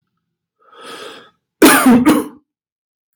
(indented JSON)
{
  "cough_length": "3.2 s",
  "cough_amplitude": 32768,
  "cough_signal_mean_std_ratio": 0.4,
  "survey_phase": "beta (2021-08-13 to 2022-03-07)",
  "age": "45-64",
  "gender": "Male",
  "wearing_mask": "No",
  "symptom_none": true,
  "smoker_status": "Ex-smoker",
  "respiratory_condition_asthma": false,
  "respiratory_condition_other": false,
  "recruitment_source": "REACT",
  "submission_delay": "6 days",
  "covid_test_result": "Negative",
  "covid_test_method": "RT-qPCR",
  "influenza_a_test_result": "Negative",
  "influenza_b_test_result": "Negative"
}